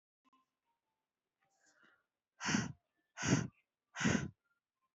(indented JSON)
{
  "exhalation_length": "4.9 s",
  "exhalation_amplitude": 3675,
  "exhalation_signal_mean_std_ratio": 0.31,
  "survey_phase": "beta (2021-08-13 to 2022-03-07)",
  "age": "18-44",
  "gender": "Female",
  "wearing_mask": "No",
  "symptom_runny_or_blocked_nose": true,
  "symptom_onset": "8 days",
  "smoker_status": "Never smoked",
  "respiratory_condition_asthma": true,
  "respiratory_condition_other": false,
  "recruitment_source": "REACT",
  "submission_delay": "3 days",
  "covid_test_result": "Negative",
  "covid_test_method": "RT-qPCR",
  "influenza_a_test_result": "Negative",
  "influenza_b_test_result": "Negative"
}